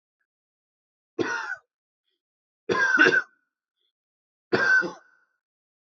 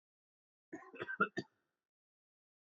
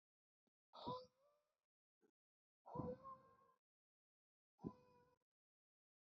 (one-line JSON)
{"three_cough_length": "6.0 s", "three_cough_amplitude": 18011, "three_cough_signal_mean_std_ratio": 0.35, "cough_length": "2.6 s", "cough_amplitude": 3573, "cough_signal_mean_std_ratio": 0.24, "exhalation_length": "6.1 s", "exhalation_amplitude": 584, "exhalation_signal_mean_std_ratio": 0.3, "survey_phase": "beta (2021-08-13 to 2022-03-07)", "age": "18-44", "gender": "Male", "wearing_mask": "No", "symptom_none": true, "smoker_status": "Never smoked", "respiratory_condition_asthma": false, "respiratory_condition_other": false, "recruitment_source": "Test and Trace", "submission_delay": "2 days", "covid_test_result": "Negative", "covid_test_method": "RT-qPCR"}